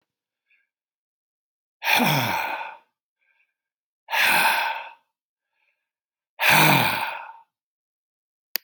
{"exhalation_length": "8.6 s", "exhalation_amplitude": 32767, "exhalation_signal_mean_std_ratio": 0.4, "survey_phase": "beta (2021-08-13 to 2022-03-07)", "age": "65+", "gender": "Male", "wearing_mask": "No", "symptom_none": true, "smoker_status": "Never smoked", "respiratory_condition_asthma": false, "respiratory_condition_other": false, "recruitment_source": "REACT", "submission_delay": "4 days", "covid_test_result": "Negative", "covid_test_method": "RT-qPCR"}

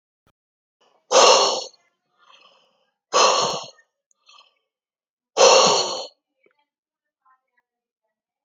{"exhalation_length": "8.4 s", "exhalation_amplitude": 32515, "exhalation_signal_mean_std_ratio": 0.33, "survey_phase": "alpha (2021-03-01 to 2021-08-12)", "age": "45-64", "gender": "Male", "wearing_mask": "No", "symptom_none": true, "smoker_status": "Never smoked", "respiratory_condition_asthma": true, "respiratory_condition_other": false, "recruitment_source": "REACT", "submission_delay": "5 days", "covid_test_result": "Negative", "covid_test_method": "RT-qPCR"}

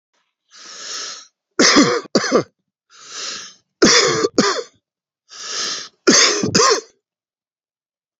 {"three_cough_length": "8.2 s", "three_cough_amplitude": 32768, "three_cough_signal_mean_std_ratio": 0.45, "survey_phase": "beta (2021-08-13 to 2022-03-07)", "age": "65+", "gender": "Male", "wearing_mask": "No", "symptom_none": true, "smoker_status": "Ex-smoker", "respiratory_condition_asthma": false, "respiratory_condition_other": false, "recruitment_source": "REACT", "submission_delay": "5 days", "covid_test_result": "Negative", "covid_test_method": "RT-qPCR"}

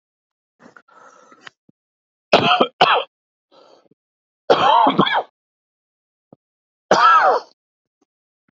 {"three_cough_length": "8.5 s", "three_cough_amplitude": 32767, "three_cough_signal_mean_std_ratio": 0.36, "survey_phase": "beta (2021-08-13 to 2022-03-07)", "age": "18-44", "gender": "Male", "wearing_mask": "No", "symptom_sore_throat": true, "symptom_headache": true, "smoker_status": "Current smoker (e-cigarettes or vapes only)", "respiratory_condition_asthma": false, "respiratory_condition_other": false, "recruitment_source": "Test and Trace", "submission_delay": "1 day", "covid_test_result": "Positive", "covid_test_method": "RT-qPCR", "covid_ct_value": 33.0, "covid_ct_gene": "N gene"}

